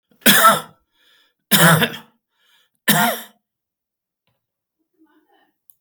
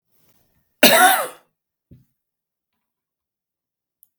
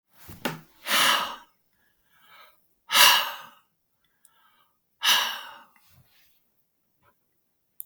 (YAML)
three_cough_length: 5.8 s
three_cough_amplitude: 32768
three_cough_signal_mean_std_ratio: 0.33
cough_length: 4.2 s
cough_amplitude: 32768
cough_signal_mean_std_ratio: 0.25
exhalation_length: 7.9 s
exhalation_amplitude: 32768
exhalation_signal_mean_std_ratio: 0.31
survey_phase: beta (2021-08-13 to 2022-03-07)
age: 65+
gender: Male
wearing_mask: 'No'
symptom_none: true
smoker_status: Never smoked
respiratory_condition_asthma: false
respiratory_condition_other: false
recruitment_source: REACT
submission_delay: 3 days
covid_test_result: Negative
covid_test_method: RT-qPCR